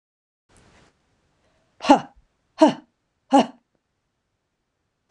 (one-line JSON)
{"exhalation_length": "5.1 s", "exhalation_amplitude": 26028, "exhalation_signal_mean_std_ratio": 0.21, "survey_phase": "beta (2021-08-13 to 2022-03-07)", "age": "65+", "gender": "Female", "wearing_mask": "No", "symptom_runny_or_blocked_nose": true, "symptom_change_to_sense_of_smell_or_taste": true, "symptom_onset": "12 days", "smoker_status": "Ex-smoker", "respiratory_condition_asthma": false, "respiratory_condition_other": false, "recruitment_source": "REACT", "submission_delay": "2 days", "covid_test_result": "Negative", "covid_test_method": "RT-qPCR"}